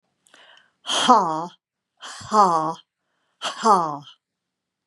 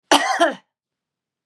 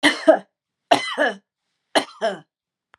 {
  "exhalation_length": "4.9 s",
  "exhalation_amplitude": 29486,
  "exhalation_signal_mean_std_ratio": 0.4,
  "cough_length": "1.5 s",
  "cough_amplitude": 32420,
  "cough_signal_mean_std_ratio": 0.39,
  "three_cough_length": "3.0 s",
  "three_cough_amplitude": 30349,
  "three_cough_signal_mean_std_ratio": 0.37,
  "survey_phase": "beta (2021-08-13 to 2022-03-07)",
  "age": "65+",
  "gender": "Female",
  "wearing_mask": "No",
  "symptom_none": true,
  "smoker_status": "Ex-smoker",
  "respiratory_condition_asthma": false,
  "respiratory_condition_other": false,
  "recruitment_source": "REACT",
  "submission_delay": "1 day",
  "covid_test_result": "Negative",
  "covid_test_method": "RT-qPCR",
  "influenza_a_test_result": "Negative",
  "influenza_b_test_result": "Negative"
}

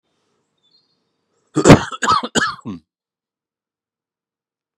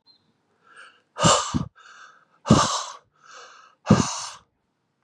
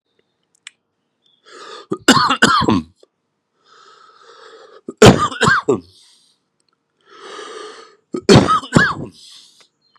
{
  "cough_length": "4.8 s",
  "cough_amplitude": 32768,
  "cough_signal_mean_std_ratio": 0.25,
  "exhalation_length": "5.0 s",
  "exhalation_amplitude": 28736,
  "exhalation_signal_mean_std_ratio": 0.34,
  "three_cough_length": "10.0 s",
  "three_cough_amplitude": 32768,
  "three_cough_signal_mean_std_ratio": 0.34,
  "survey_phase": "beta (2021-08-13 to 2022-03-07)",
  "age": "18-44",
  "gender": "Male",
  "wearing_mask": "No",
  "symptom_cough_any": true,
  "symptom_runny_or_blocked_nose": true,
  "symptom_headache": true,
  "smoker_status": "Ex-smoker",
  "respiratory_condition_asthma": true,
  "respiratory_condition_other": false,
  "recruitment_source": "Test and Trace",
  "submission_delay": "1 day",
  "covid_test_result": "Positive",
  "covid_test_method": "RT-qPCR",
  "covid_ct_value": 19.0,
  "covid_ct_gene": "ORF1ab gene",
  "covid_ct_mean": 19.1,
  "covid_viral_load": "560000 copies/ml",
  "covid_viral_load_category": "Low viral load (10K-1M copies/ml)"
}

